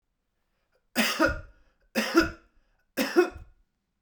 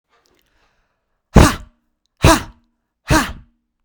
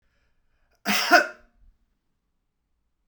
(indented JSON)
{
  "three_cough_length": "4.0 s",
  "three_cough_amplitude": 13930,
  "three_cough_signal_mean_std_ratio": 0.38,
  "exhalation_length": "3.8 s",
  "exhalation_amplitude": 32768,
  "exhalation_signal_mean_std_ratio": 0.28,
  "cough_length": "3.1 s",
  "cough_amplitude": 24380,
  "cough_signal_mean_std_ratio": 0.25,
  "survey_phase": "beta (2021-08-13 to 2022-03-07)",
  "age": "18-44",
  "gender": "Male",
  "wearing_mask": "No",
  "symptom_none": true,
  "smoker_status": "Ex-smoker",
  "respiratory_condition_asthma": false,
  "respiratory_condition_other": false,
  "recruitment_source": "REACT",
  "submission_delay": "2 days",
  "covid_test_result": "Negative",
  "covid_test_method": "RT-qPCR",
  "influenza_a_test_result": "Negative",
  "influenza_b_test_result": "Negative"
}